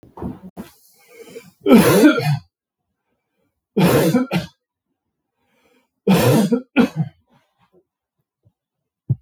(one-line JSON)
{"three_cough_length": "9.2 s", "three_cough_amplitude": 32768, "three_cough_signal_mean_std_ratio": 0.4, "survey_phase": "beta (2021-08-13 to 2022-03-07)", "age": "45-64", "gender": "Male", "wearing_mask": "No", "symptom_cough_any": true, "symptom_new_continuous_cough": true, "symptom_change_to_sense_of_smell_or_taste": true, "symptom_onset": "8 days", "smoker_status": "Never smoked", "respiratory_condition_asthma": false, "respiratory_condition_other": false, "recruitment_source": "Test and Trace", "submission_delay": "3 days", "covid_test_result": "Positive", "covid_test_method": "RT-qPCR", "covid_ct_value": 20.2, "covid_ct_gene": "ORF1ab gene"}